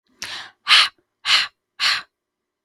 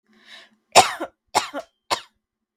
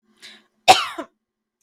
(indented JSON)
{
  "exhalation_length": "2.6 s",
  "exhalation_amplitude": 32768,
  "exhalation_signal_mean_std_ratio": 0.39,
  "three_cough_length": "2.6 s",
  "three_cough_amplitude": 32768,
  "three_cough_signal_mean_std_ratio": 0.26,
  "cough_length": "1.6 s",
  "cough_amplitude": 32768,
  "cough_signal_mean_std_ratio": 0.24,
  "survey_phase": "beta (2021-08-13 to 2022-03-07)",
  "age": "18-44",
  "gender": "Female",
  "wearing_mask": "No",
  "symptom_none": true,
  "smoker_status": "Never smoked",
  "respiratory_condition_asthma": false,
  "respiratory_condition_other": false,
  "recruitment_source": "REACT",
  "submission_delay": "1 day",
  "covid_test_result": "Negative",
  "covid_test_method": "RT-qPCR",
  "influenza_a_test_result": "Unknown/Void",
  "influenza_b_test_result": "Unknown/Void"
}